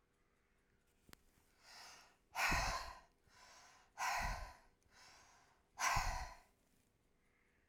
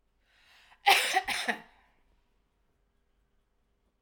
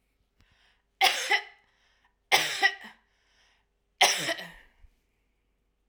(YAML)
exhalation_length: 7.7 s
exhalation_amplitude: 2194
exhalation_signal_mean_std_ratio: 0.4
cough_length: 4.0 s
cough_amplitude: 11959
cough_signal_mean_std_ratio: 0.28
three_cough_length: 5.9 s
three_cough_amplitude: 16588
three_cough_signal_mean_std_ratio: 0.32
survey_phase: alpha (2021-03-01 to 2021-08-12)
age: 45-64
gender: Female
wearing_mask: 'No'
symptom_none: true
smoker_status: Ex-smoker
respiratory_condition_asthma: false
respiratory_condition_other: false
recruitment_source: REACT
submission_delay: 2 days
covid_test_result: Negative
covid_test_method: RT-qPCR